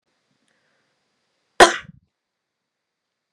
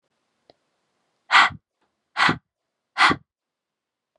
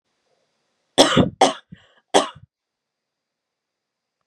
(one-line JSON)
{"cough_length": "3.3 s", "cough_amplitude": 32768, "cough_signal_mean_std_ratio": 0.14, "exhalation_length": "4.2 s", "exhalation_amplitude": 29095, "exhalation_signal_mean_std_ratio": 0.27, "three_cough_length": "4.3 s", "three_cough_amplitude": 32767, "three_cough_signal_mean_std_ratio": 0.26, "survey_phase": "beta (2021-08-13 to 2022-03-07)", "age": "18-44", "gender": "Female", "wearing_mask": "No", "symptom_none": true, "smoker_status": "Never smoked", "respiratory_condition_asthma": false, "respiratory_condition_other": false, "recruitment_source": "REACT", "submission_delay": "2 days", "covid_test_result": "Negative", "covid_test_method": "RT-qPCR", "influenza_a_test_result": "Negative", "influenza_b_test_result": "Negative"}